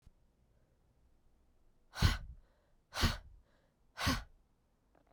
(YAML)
exhalation_length: 5.1 s
exhalation_amplitude: 6057
exhalation_signal_mean_std_ratio: 0.29
survey_phase: beta (2021-08-13 to 2022-03-07)
age: 18-44
gender: Female
wearing_mask: 'No'
symptom_cough_any: true
symptom_new_continuous_cough: true
symptom_runny_or_blocked_nose: true
symptom_shortness_of_breath: true
symptom_sore_throat: true
symptom_fatigue: true
symptom_fever_high_temperature: true
symptom_headache: true
symptom_change_to_sense_of_smell_or_taste: true
symptom_loss_of_taste: true
symptom_onset: 4 days
smoker_status: Ex-smoker
respiratory_condition_asthma: false
respiratory_condition_other: false
recruitment_source: Test and Trace
submission_delay: 1 day
covid_test_result: Positive
covid_test_method: RT-qPCR
covid_ct_value: 19.0
covid_ct_gene: ORF1ab gene